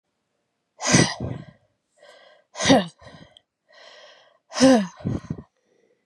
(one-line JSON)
{"exhalation_length": "6.1 s", "exhalation_amplitude": 25305, "exhalation_signal_mean_std_ratio": 0.33, "survey_phase": "beta (2021-08-13 to 2022-03-07)", "age": "45-64", "gender": "Female", "wearing_mask": "No", "symptom_none": true, "smoker_status": "Ex-smoker", "respiratory_condition_asthma": false, "respiratory_condition_other": false, "recruitment_source": "REACT", "submission_delay": "2 days", "covid_test_result": "Negative", "covid_test_method": "RT-qPCR"}